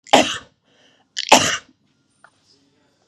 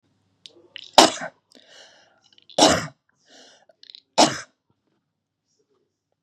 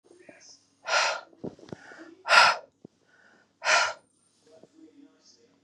cough_length: 3.1 s
cough_amplitude: 32768
cough_signal_mean_std_ratio: 0.28
three_cough_length: 6.2 s
three_cough_amplitude: 32768
three_cough_signal_mean_std_ratio: 0.23
exhalation_length: 5.6 s
exhalation_amplitude: 18659
exhalation_signal_mean_std_ratio: 0.32
survey_phase: beta (2021-08-13 to 2022-03-07)
age: 45-64
gender: Female
wearing_mask: 'No'
symptom_none: true
smoker_status: Never smoked
respiratory_condition_asthma: false
respiratory_condition_other: false
recruitment_source: REACT
submission_delay: 1 day
covid_test_result: Negative
covid_test_method: RT-qPCR
influenza_a_test_result: Negative
influenza_b_test_result: Negative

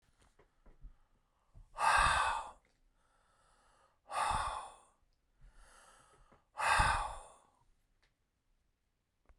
exhalation_length: 9.4 s
exhalation_amplitude: 5094
exhalation_signal_mean_std_ratio: 0.36
survey_phase: beta (2021-08-13 to 2022-03-07)
age: 45-64
gender: Male
wearing_mask: 'No'
symptom_fatigue: true
symptom_headache: true
smoker_status: Never smoked
respiratory_condition_asthma: false
respiratory_condition_other: false
recruitment_source: REACT
submission_delay: 2 days
covid_test_result: Negative
covid_test_method: RT-qPCR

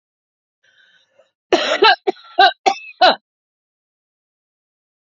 three_cough_length: 5.1 s
three_cough_amplitude: 29425
three_cough_signal_mean_std_ratio: 0.3
survey_phase: beta (2021-08-13 to 2022-03-07)
age: 45-64
gender: Female
wearing_mask: 'No'
symptom_none: true
smoker_status: Current smoker (11 or more cigarettes per day)
respiratory_condition_asthma: true
respiratory_condition_other: false
recruitment_source: REACT
submission_delay: 5 days
covid_test_result: Negative
covid_test_method: RT-qPCR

